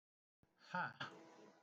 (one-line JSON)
{"exhalation_length": "1.6 s", "exhalation_amplitude": 960, "exhalation_signal_mean_std_ratio": 0.41, "survey_phase": "beta (2021-08-13 to 2022-03-07)", "age": "65+", "gender": "Male", "wearing_mask": "No", "symptom_none": true, "smoker_status": "Never smoked", "respiratory_condition_asthma": false, "respiratory_condition_other": false, "recruitment_source": "REACT", "submission_delay": "3 days", "covid_test_result": "Negative", "covid_test_method": "RT-qPCR", "influenza_a_test_result": "Negative", "influenza_b_test_result": "Negative"}